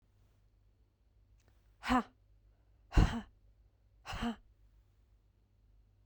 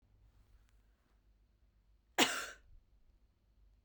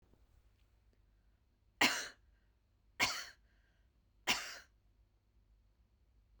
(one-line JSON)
{"exhalation_length": "6.1 s", "exhalation_amplitude": 6796, "exhalation_signal_mean_std_ratio": 0.25, "cough_length": "3.8 s", "cough_amplitude": 6429, "cough_signal_mean_std_ratio": 0.22, "three_cough_length": "6.4 s", "three_cough_amplitude": 5143, "three_cough_signal_mean_std_ratio": 0.26, "survey_phase": "beta (2021-08-13 to 2022-03-07)", "age": "45-64", "gender": "Female", "wearing_mask": "No", "symptom_none": true, "smoker_status": "Ex-smoker", "respiratory_condition_asthma": false, "respiratory_condition_other": false, "recruitment_source": "REACT", "submission_delay": "1 day", "covid_test_result": "Negative", "covid_test_method": "RT-qPCR"}